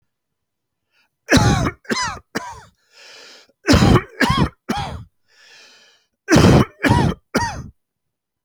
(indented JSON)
{
  "three_cough_length": "8.4 s",
  "three_cough_amplitude": 29438,
  "three_cough_signal_mean_std_ratio": 0.43,
  "survey_phase": "beta (2021-08-13 to 2022-03-07)",
  "age": "45-64",
  "gender": "Male",
  "wearing_mask": "No",
  "symptom_none": true,
  "smoker_status": "Never smoked",
  "respiratory_condition_asthma": false,
  "respiratory_condition_other": false,
  "recruitment_source": "REACT",
  "submission_delay": "2 days",
  "covid_test_result": "Negative",
  "covid_test_method": "RT-qPCR"
}